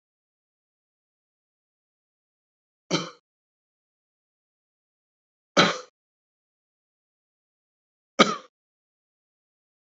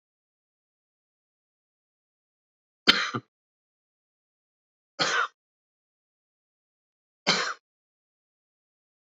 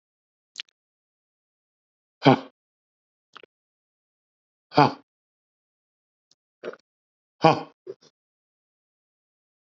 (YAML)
cough_length: 10.0 s
cough_amplitude: 28498
cough_signal_mean_std_ratio: 0.15
three_cough_length: 9.0 s
three_cough_amplitude: 28653
three_cough_signal_mean_std_ratio: 0.2
exhalation_length: 9.7 s
exhalation_amplitude: 28059
exhalation_signal_mean_std_ratio: 0.15
survey_phase: beta (2021-08-13 to 2022-03-07)
age: 45-64
gender: Male
wearing_mask: 'No'
symptom_runny_or_blocked_nose: true
symptom_headache: true
smoker_status: Ex-smoker
respiratory_condition_asthma: true
respiratory_condition_other: false
recruitment_source: REACT
submission_delay: 3 days
covid_test_result: Negative
covid_test_method: RT-qPCR
influenza_a_test_result: Negative
influenza_b_test_result: Negative